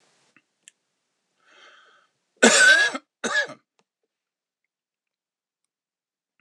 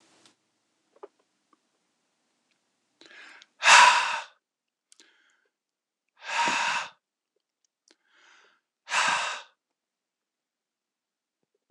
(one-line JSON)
{"cough_length": "6.4 s", "cough_amplitude": 26028, "cough_signal_mean_std_ratio": 0.26, "exhalation_length": "11.7 s", "exhalation_amplitude": 25117, "exhalation_signal_mean_std_ratio": 0.25, "survey_phase": "beta (2021-08-13 to 2022-03-07)", "age": "65+", "gender": "Male", "wearing_mask": "No", "symptom_cough_any": true, "symptom_runny_or_blocked_nose": true, "symptom_shortness_of_breath": true, "symptom_sore_throat": true, "symptom_fatigue": true, "symptom_headache": true, "symptom_change_to_sense_of_smell_or_taste": true, "smoker_status": "Ex-smoker", "respiratory_condition_asthma": false, "respiratory_condition_other": false, "recruitment_source": "Test and Trace", "submission_delay": "2 days", "covid_test_result": "Positive", "covid_test_method": "RT-qPCR", "covid_ct_value": 26.2, "covid_ct_gene": "N gene", "covid_ct_mean": 26.4, "covid_viral_load": "2300 copies/ml", "covid_viral_load_category": "Minimal viral load (< 10K copies/ml)"}